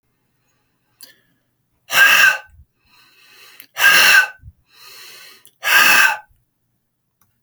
{"exhalation_length": "7.4 s", "exhalation_amplitude": 32768, "exhalation_signal_mean_std_ratio": 0.38, "survey_phase": "alpha (2021-03-01 to 2021-08-12)", "age": "45-64", "gender": "Male", "wearing_mask": "No", "symptom_none": true, "smoker_status": "Never smoked", "respiratory_condition_asthma": false, "respiratory_condition_other": false, "recruitment_source": "REACT", "submission_delay": "3 days", "covid_test_result": "Negative", "covid_test_method": "RT-qPCR"}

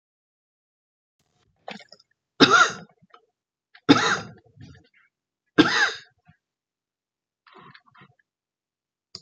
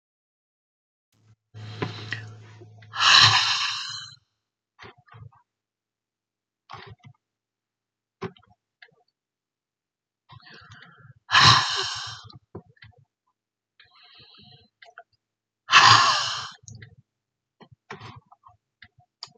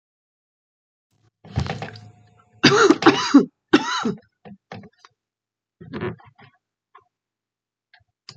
{"three_cough_length": "9.2 s", "three_cough_amplitude": 31031, "three_cough_signal_mean_std_ratio": 0.24, "exhalation_length": "19.4 s", "exhalation_amplitude": 28746, "exhalation_signal_mean_std_ratio": 0.27, "cough_length": "8.4 s", "cough_amplitude": 28762, "cough_signal_mean_std_ratio": 0.29, "survey_phase": "beta (2021-08-13 to 2022-03-07)", "age": "65+", "gender": "Female", "wearing_mask": "No", "symptom_none": true, "smoker_status": "Never smoked", "respiratory_condition_asthma": false, "respiratory_condition_other": false, "recruitment_source": "REACT", "submission_delay": "3 days", "covid_test_result": "Negative", "covid_test_method": "RT-qPCR"}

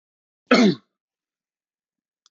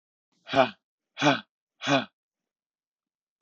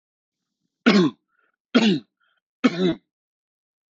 {"cough_length": "2.3 s", "cough_amplitude": 24528, "cough_signal_mean_std_ratio": 0.26, "exhalation_length": "3.4 s", "exhalation_amplitude": 15491, "exhalation_signal_mean_std_ratio": 0.3, "three_cough_length": "3.9 s", "three_cough_amplitude": 24151, "three_cough_signal_mean_std_ratio": 0.35, "survey_phase": "beta (2021-08-13 to 2022-03-07)", "age": "45-64", "gender": "Male", "wearing_mask": "No", "symptom_none": true, "smoker_status": "Ex-smoker", "respiratory_condition_asthma": false, "respiratory_condition_other": false, "recruitment_source": "REACT", "submission_delay": "3 days", "covid_test_result": "Negative", "covid_test_method": "RT-qPCR", "influenza_a_test_result": "Negative", "influenza_b_test_result": "Negative"}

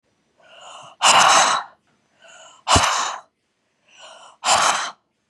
{"exhalation_length": "5.3 s", "exhalation_amplitude": 30066, "exhalation_signal_mean_std_ratio": 0.44, "survey_phase": "beta (2021-08-13 to 2022-03-07)", "age": "18-44", "gender": "Female", "wearing_mask": "No", "symptom_none": true, "smoker_status": "Never smoked", "respiratory_condition_asthma": false, "respiratory_condition_other": false, "recruitment_source": "REACT", "submission_delay": "1 day", "covid_test_result": "Negative", "covid_test_method": "RT-qPCR", "influenza_a_test_result": "Negative", "influenza_b_test_result": "Negative"}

